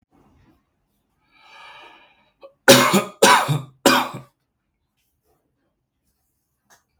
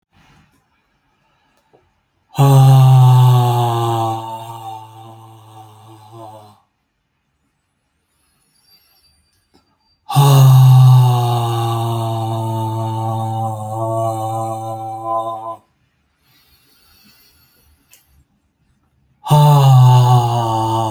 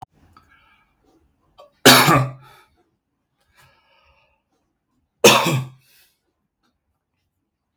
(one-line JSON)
{"three_cough_length": "7.0 s", "three_cough_amplitude": 32767, "three_cough_signal_mean_std_ratio": 0.28, "exhalation_length": "20.9 s", "exhalation_amplitude": 31447, "exhalation_signal_mean_std_ratio": 0.53, "cough_length": "7.8 s", "cough_amplitude": 32768, "cough_signal_mean_std_ratio": 0.25, "survey_phase": "beta (2021-08-13 to 2022-03-07)", "age": "45-64", "gender": "Male", "wearing_mask": "No", "symptom_diarrhoea": true, "smoker_status": "Never smoked", "respiratory_condition_asthma": true, "respiratory_condition_other": false, "recruitment_source": "REACT", "submission_delay": "2 days", "covid_test_result": "Negative", "covid_test_method": "RT-qPCR"}